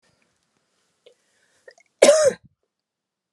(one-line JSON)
{"cough_length": "3.3 s", "cough_amplitude": 32737, "cough_signal_mean_std_ratio": 0.24, "survey_phase": "beta (2021-08-13 to 2022-03-07)", "age": "18-44", "gender": "Female", "wearing_mask": "No", "symptom_cough_any": true, "symptom_runny_or_blocked_nose": true, "symptom_fatigue": true, "symptom_headache": true, "symptom_other": true, "smoker_status": "Never smoked", "respiratory_condition_asthma": false, "respiratory_condition_other": false, "recruitment_source": "Test and Trace", "submission_delay": "1 day", "covid_test_result": "Positive", "covid_test_method": "RT-qPCR", "covid_ct_value": 20.6, "covid_ct_gene": "ORF1ab gene", "covid_ct_mean": 21.5, "covid_viral_load": "89000 copies/ml", "covid_viral_load_category": "Low viral load (10K-1M copies/ml)"}